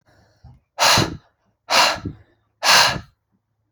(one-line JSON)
{"exhalation_length": "3.7 s", "exhalation_amplitude": 32688, "exhalation_signal_mean_std_ratio": 0.42, "survey_phase": "alpha (2021-03-01 to 2021-08-12)", "age": "18-44", "gender": "Male", "wearing_mask": "No", "symptom_none": true, "smoker_status": "Never smoked", "respiratory_condition_asthma": false, "respiratory_condition_other": false, "recruitment_source": "REACT", "submission_delay": "1 day", "covid_test_result": "Negative", "covid_test_method": "RT-qPCR"}